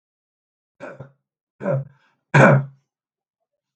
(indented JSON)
{
  "three_cough_length": "3.8 s",
  "three_cough_amplitude": 28730,
  "three_cough_signal_mean_std_ratio": 0.28,
  "survey_phase": "beta (2021-08-13 to 2022-03-07)",
  "age": "45-64",
  "gender": "Male",
  "wearing_mask": "No",
  "symptom_fatigue": true,
  "smoker_status": "Never smoked",
  "respiratory_condition_asthma": false,
  "respiratory_condition_other": true,
  "recruitment_source": "REACT",
  "submission_delay": "0 days",
  "covid_test_result": "Negative",
  "covid_test_method": "RT-qPCR"
}